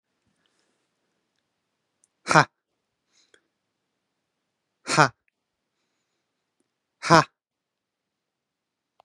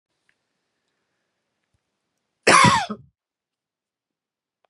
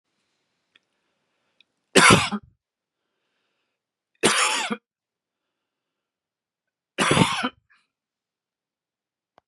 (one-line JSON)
{"exhalation_length": "9.0 s", "exhalation_amplitude": 32767, "exhalation_signal_mean_std_ratio": 0.14, "cough_length": "4.7 s", "cough_amplitude": 31170, "cough_signal_mean_std_ratio": 0.23, "three_cough_length": "9.5 s", "three_cough_amplitude": 32767, "three_cough_signal_mean_std_ratio": 0.27, "survey_phase": "beta (2021-08-13 to 2022-03-07)", "age": "45-64", "gender": "Male", "wearing_mask": "No", "symptom_none": true, "smoker_status": "Never smoked", "respiratory_condition_asthma": false, "respiratory_condition_other": false, "recruitment_source": "REACT", "submission_delay": "2 days", "covid_test_result": "Negative", "covid_test_method": "RT-qPCR", "influenza_a_test_result": "Negative", "influenza_b_test_result": "Negative"}